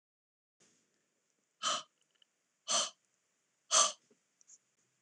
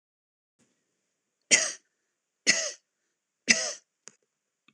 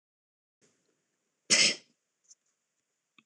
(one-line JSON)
{"exhalation_length": "5.0 s", "exhalation_amplitude": 7914, "exhalation_signal_mean_std_ratio": 0.25, "three_cough_length": "4.7 s", "three_cough_amplitude": 21651, "three_cough_signal_mean_std_ratio": 0.25, "cough_length": "3.3 s", "cough_amplitude": 10566, "cough_signal_mean_std_ratio": 0.21, "survey_phase": "alpha (2021-03-01 to 2021-08-12)", "age": "45-64", "gender": "Female", "wearing_mask": "No", "symptom_none": true, "smoker_status": "Never smoked", "respiratory_condition_asthma": false, "respiratory_condition_other": false, "recruitment_source": "REACT", "submission_delay": "1 day", "covid_test_result": "Negative", "covid_test_method": "RT-qPCR"}